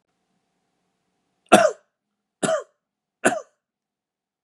{
  "three_cough_length": "4.4 s",
  "three_cough_amplitude": 32768,
  "three_cough_signal_mean_std_ratio": 0.23,
  "survey_phase": "beta (2021-08-13 to 2022-03-07)",
  "age": "18-44",
  "gender": "Male",
  "wearing_mask": "No",
  "symptom_none": true,
  "smoker_status": "Never smoked",
  "respiratory_condition_asthma": false,
  "respiratory_condition_other": false,
  "recruitment_source": "REACT",
  "submission_delay": "3 days",
  "covid_test_result": "Negative",
  "covid_test_method": "RT-qPCR",
  "influenza_a_test_result": "Negative",
  "influenza_b_test_result": "Negative"
}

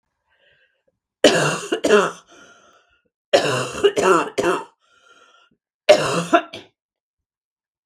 {
  "three_cough_length": "7.9 s",
  "three_cough_amplitude": 32767,
  "three_cough_signal_mean_std_ratio": 0.4,
  "survey_phase": "beta (2021-08-13 to 2022-03-07)",
  "age": "45-64",
  "gender": "Female",
  "wearing_mask": "No",
  "symptom_cough_any": true,
  "symptom_runny_or_blocked_nose": true,
  "symptom_sore_throat": true,
  "symptom_headache": true,
  "symptom_onset": "3 days",
  "smoker_status": "Ex-smoker",
  "respiratory_condition_asthma": false,
  "respiratory_condition_other": false,
  "recruitment_source": "Test and Trace",
  "submission_delay": "1 day",
  "covid_test_result": "Positive",
  "covid_test_method": "RT-qPCR",
  "covid_ct_value": 20.1,
  "covid_ct_gene": "ORF1ab gene"
}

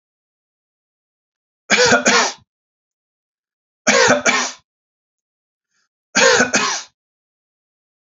{
  "three_cough_length": "8.2 s",
  "three_cough_amplitude": 32768,
  "three_cough_signal_mean_std_ratio": 0.37,
  "survey_phase": "beta (2021-08-13 to 2022-03-07)",
  "age": "45-64",
  "gender": "Male",
  "wearing_mask": "No",
  "symptom_loss_of_taste": true,
  "symptom_onset": "3 days",
  "smoker_status": "Never smoked",
  "respiratory_condition_asthma": false,
  "respiratory_condition_other": false,
  "recruitment_source": "Test and Trace",
  "submission_delay": "2 days",
  "covid_test_result": "Positive",
  "covid_test_method": "RT-qPCR"
}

